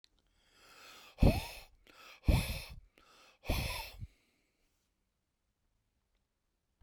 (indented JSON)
{
  "exhalation_length": "6.8 s",
  "exhalation_amplitude": 7388,
  "exhalation_signal_mean_std_ratio": 0.27,
  "survey_phase": "beta (2021-08-13 to 2022-03-07)",
  "age": "65+",
  "gender": "Male",
  "wearing_mask": "No",
  "symptom_none": true,
  "smoker_status": "Never smoked",
  "respiratory_condition_asthma": false,
  "respiratory_condition_other": false,
  "recruitment_source": "REACT",
  "submission_delay": "2 days",
  "covid_test_result": "Negative",
  "covid_test_method": "RT-qPCR"
}